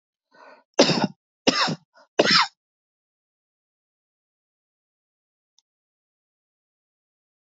{"three_cough_length": "7.5 s", "three_cough_amplitude": 26660, "three_cough_signal_mean_std_ratio": 0.24, "survey_phase": "alpha (2021-03-01 to 2021-08-12)", "age": "45-64", "gender": "Male", "wearing_mask": "No", "symptom_headache": true, "smoker_status": "Never smoked", "respiratory_condition_asthma": false, "respiratory_condition_other": false, "recruitment_source": "REACT", "submission_delay": "1 day", "covid_test_result": "Negative", "covid_test_method": "RT-qPCR"}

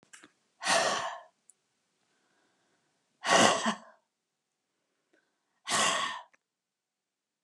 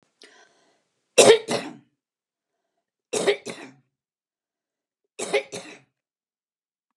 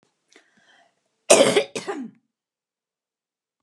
{"exhalation_length": "7.4 s", "exhalation_amplitude": 14312, "exhalation_signal_mean_std_ratio": 0.34, "three_cough_length": "7.0 s", "three_cough_amplitude": 32089, "three_cough_signal_mean_std_ratio": 0.23, "cough_length": "3.6 s", "cough_amplitude": 31729, "cough_signal_mean_std_ratio": 0.26, "survey_phase": "beta (2021-08-13 to 2022-03-07)", "age": "65+", "gender": "Female", "wearing_mask": "No", "symptom_none": true, "smoker_status": "Never smoked", "respiratory_condition_asthma": false, "respiratory_condition_other": false, "recruitment_source": "REACT", "submission_delay": "1 day", "covid_test_result": "Negative", "covid_test_method": "RT-qPCR", "influenza_a_test_result": "Negative", "influenza_b_test_result": "Negative"}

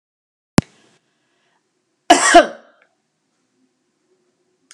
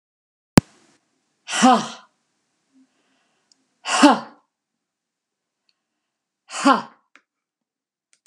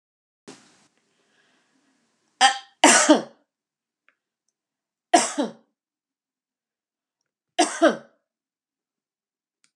{"cough_length": "4.7 s", "cough_amplitude": 32768, "cough_signal_mean_std_ratio": 0.21, "exhalation_length": "8.3 s", "exhalation_amplitude": 32768, "exhalation_signal_mean_std_ratio": 0.23, "three_cough_length": "9.8 s", "three_cough_amplitude": 31707, "three_cough_signal_mean_std_ratio": 0.24, "survey_phase": "beta (2021-08-13 to 2022-03-07)", "age": "65+", "gender": "Female", "wearing_mask": "No", "symptom_none": true, "smoker_status": "Never smoked", "respiratory_condition_asthma": false, "respiratory_condition_other": false, "recruitment_source": "Test and Trace", "submission_delay": "0 days", "covid_test_result": "Negative", "covid_test_method": "LFT"}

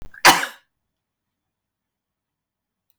{"cough_length": "3.0 s", "cough_amplitude": 32768, "cough_signal_mean_std_ratio": 0.19, "survey_phase": "beta (2021-08-13 to 2022-03-07)", "age": "65+", "gender": "Female", "wearing_mask": "No", "symptom_none": true, "smoker_status": "Ex-smoker", "respiratory_condition_asthma": false, "respiratory_condition_other": false, "recruitment_source": "REACT", "submission_delay": "11 days", "covid_test_result": "Negative", "covid_test_method": "RT-qPCR", "influenza_a_test_result": "Negative", "influenza_b_test_result": "Negative"}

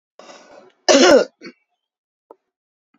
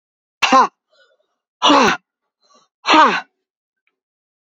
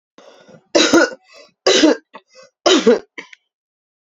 {"cough_length": "3.0 s", "cough_amplitude": 29633, "cough_signal_mean_std_ratio": 0.3, "exhalation_length": "4.4 s", "exhalation_amplitude": 29546, "exhalation_signal_mean_std_ratio": 0.37, "three_cough_length": "4.2 s", "three_cough_amplitude": 30821, "three_cough_signal_mean_std_ratio": 0.4, "survey_phase": "beta (2021-08-13 to 2022-03-07)", "age": "45-64", "gender": "Female", "wearing_mask": "No", "symptom_cough_any": true, "smoker_status": "Never smoked", "respiratory_condition_asthma": false, "respiratory_condition_other": false, "recruitment_source": "Test and Trace", "submission_delay": "1 day", "covid_test_result": "Positive", "covid_test_method": "RT-qPCR", "covid_ct_value": 24.7, "covid_ct_gene": "ORF1ab gene"}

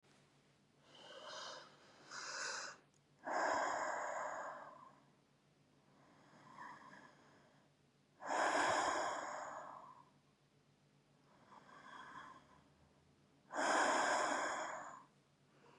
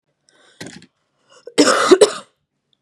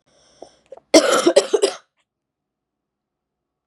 {"exhalation_length": "15.8 s", "exhalation_amplitude": 2274, "exhalation_signal_mean_std_ratio": 0.5, "cough_length": "2.8 s", "cough_amplitude": 32768, "cough_signal_mean_std_ratio": 0.32, "three_cough_length": "3.7 s", "three_cough_amplitude": 32767, "three_cough_signal_mean_std_ratio": 0.3, "survey_phase": "beta (2021-08-13 to 2022-03-07)", "age": "18-44", "gender": "Female", "wearing_mask": "No", "symptom_cough_any": true, "symptom_shortness_of_breath": true, "symptom_sore_throat": true, "symptom_fatigue": true, "symptom_fever_high_temperature": true, "symptom_change_to_sense_of_smell_or_taste": true, "symptom_onset": "3 days", "smoker_status": "Ex-smoker", "respiratory_condition_asthma": false, "respiratory_condition_other": false, "recruitment_source": "Test and Trace", "submission_delay": "2 days", "covid_test_result": "Positive", "covid_test_method": "RT-qPCR", "covid_ct_value": 18.0, "covid_ct_gene": "ORF1ab gene"}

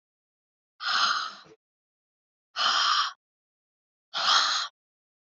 {"exhalation_length": "5.4 s", "exhalation_amplitude": 11526, "exhalation_signal_mean_std_ratio": 0.44, "survey_phase": "alpha (2021-03-01 to 2021-08-12)", "age": "45-64", "gender": "Female", "wearing_mask": "No", "symptom_none": true, "smoker_status": "Never smoked", "respiratory_condition_asthma": false, "respiratory_condition_other": false, "recruitment_source": "REACT", "submission_delay": "2 days", "covid_test_result": "Negative", "covid_test_method": "RT-qPCR"}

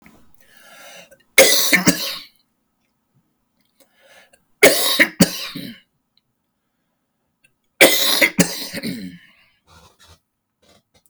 {"three_cough_length": "11.1 s", "three_cough_amplitude": 32768, "three_cough_signal_mean_std_ratio": 0.33, "survey_phase": "beta (2021-08-13 to 2022-03-07)", "age": "45-64", "gender": "Male", "wearing_mask": "No", "symptom_cough_any": true, "symptom_shortness_of_breath": true, "symptom_fatigue": true, "symptom_onset": "12 days", "smoker_status": "Ex-smoker", "respiratory_condition_asthma": true, "respiratory_condition_other": false, "recruitment_source": "REACT", "submission_delay": "3 days", "covid_test_result": "Negative", "covid_test_method": "RT-qPCR", "covid_ct_value": 37.2, "covid_ct_gene": "N gene", "influenza_a_test_result": "Negative", "influenza_b_test_result": "Negative"}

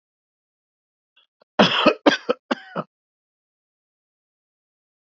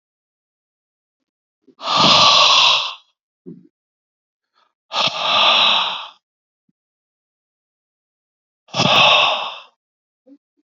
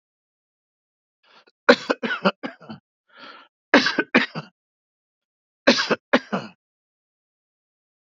{"cough_length": "5.1 s", "cough_amplitude": 28112, "cough_signal_mean_std_ratio": 0.24, "exhalation_length": "10.8 s", "exhalation_amplitude": 31672, "exhalation_signal_mean_std_ratio": 0.42, "three_cough_length": "8.1 s", "three_cough_amplitude": 32767, "three_cough_signal_mean_std_ratio": 0.26, "survey_phase": "beta (2021-08-13 to 2022-03-07)", "age": "45-64", "gender": "Male", "wearing_mask": "No", "symptom_cough_any": true, "smoker_status": "Ex-smoker", "respiratory_condition_asthma": false, "respiratory_condition_other": false, "recruitment_source": "REACT", "submission_delay": "1 day", "covid_test_result": "Negative", "covid_test_method": "RT-qPCR", "influenza_a_test_result": "Negative", "influenza_b_test_result": "Negative"}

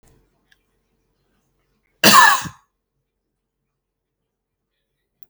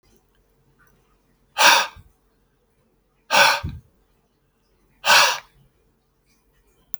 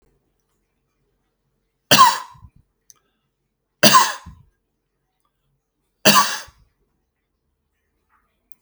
{"cough_length": "5.3 s", "cough_amplitude": 32768, "cough_signal_mean_std_ratio": 0.21, "exhalation_length": "7.0 s", "exhalation_amplitude": 30287, "exhalation_signal_mean_std_ratio": 0.29, "three_cough_length": "8.6 s", "three_cough_amplitude": 32768, "three_cough_signal_mean_std_ratio": 0.24, "survey_phase": "beta (2021-08-13 to 2022-03-07)", "age": "45-64", "gender": "Male", "wearing_mask": "No", "symptom_none": true, "smoker_status": "Ex-smoker", "respiratory_condition_asthma": false, "respiratory_condition_other": false, "recruitment_source": "REACT", "submission_delay": "0 days", "covid_test_result": "Negative", "covid_test_method": "RT-qPCR"}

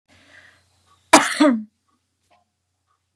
{"cough_length": "3.2 s", "cough_amplitude": 32768, "cough_signal_mean_std_ratio": 0.27, "survey_phase": "beta (2021-08-13 to 2022-03-07)", "age": "65+", "gender": "Female", "wearing_mask": "No", "symptom_none": true, "smoker_status": "Never smoked", "respiratory_condition_asthma": true, "respiratory_condition_other": false, "recruitment_source": "REACT", "submission_delay": "1 day", "covid_test_result": "Negative", "covid_test_method": "RT-qPCR", "influenza_a_test_result": "Unknown/Void", "influenza_b_test_result": "Unknown/Void"}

